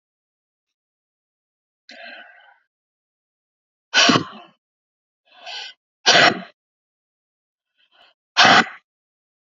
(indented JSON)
{
  "exhalation_length": "9.6 s",
  "exhalation_amplitude": 30665,
  "exhalation_signal_mean_std_ratio": 0.25,
  "survey_phase": "beta (2021-08-13 to 2022-03-07)",
  "age": "45-64",
  "gender": "Female",
  "wearing_mask": "No",
  "symptom_none": true,
  "smoker_status": "Never smoked",
  "respiratory_condition_asthma": false,
  "respiratory_condition_other": false,
  "recruitment_source": "REACT",
  "submission_delay": "5 days",
  "covid_test_result": "Negative",
  "covid_test_method": "RT-qPCR",
  "influenza_a_test_result": "Negative",
  "influenza_b_test_result": "Negative"
}